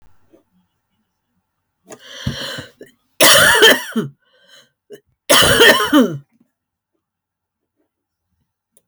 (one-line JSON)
{"cough_length": "8.9 s", "cough_amplitude": 32768, "cough_signal_mean_std_ratio": 0.35, "survey_phase": "alpha (2021-03-01 to 2021-08-12)", "age": "65+", "gender": "Female", "wearing_mask": "No", "symptom_none": true, "smoker_status": "Never smoked", "respiratory_condition_asthma": false, "respiratory_condition_other": false, "recruitment_source": "REACT", "submission_delay": "2 days", "covid_test_result": "Negative", "covid_test_method": "RT-qPCR"}